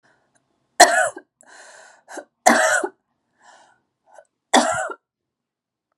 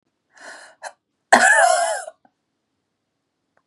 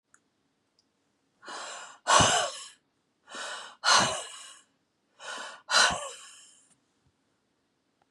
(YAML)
three_cough_length: 6.0 s
three_cough_amplitude: 32768
three_cough_signal_mean_std_ratio: 0.31
cough_length: 3.7 s
cough_amplitude: 32768
cough_signal_mean_std_ratio: 0.35
exhalation_length: 8.1 s
exhalation_amplitude: 15686
exhalation_signal_mean_std_ratio: 0.34
survey_phase: beta (2021-08-13 to 2022-03-07)
age: 45-64
gender: Female
wearing_mask: 'No'
symptom_cough_any: true
symptom_runny_or_blocked_nose: true
symptom_sore_throat: true
symptom_fatigue: true
symptom_fever_high_temperature: true
symptom_headache: true
symptom_other: true
symptom_onset: 3 days
smoker_status: Ex-smoker
respiratory_condition_asthma: true
respiratory_condition_other: false
recruitment_source: Test and Trace
submission_delay: 2 days
covid_test_result: Positive
covid_test_method: ePCR